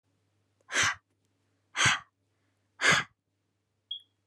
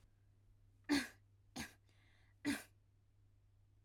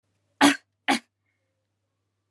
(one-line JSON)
{"exhalation_length": "4.3 s", "exhalation_amplitude": 10256, "exhalation_signal_mean_std_ratio": 0.32, "three_cough_length": "3.8 s", "three_cough_amplitude": 1670, "three_cough_signal_mean_std_ratio": 0.31, "cough_length": "2.3 s", "cough_amplitude": 21795, "cough_signal_mean_std_ratio": 0.24, "survey_phase": "alpha (2021-03-01 to 2021-08-12)", "age": "18-44", "gender": "Female", "wearing_mask": "No", "symptom_none": true, "symptom_onset": "12 days", "smoker_status": "Never smoked", "respiratory_condition_asthma": false, "respiratory_condition_other": false, "recruitment_source": "REACT", "submission_delay": "1 day", "covid_test_result": "Negative", "covid_test_method": "RT-qPCR"}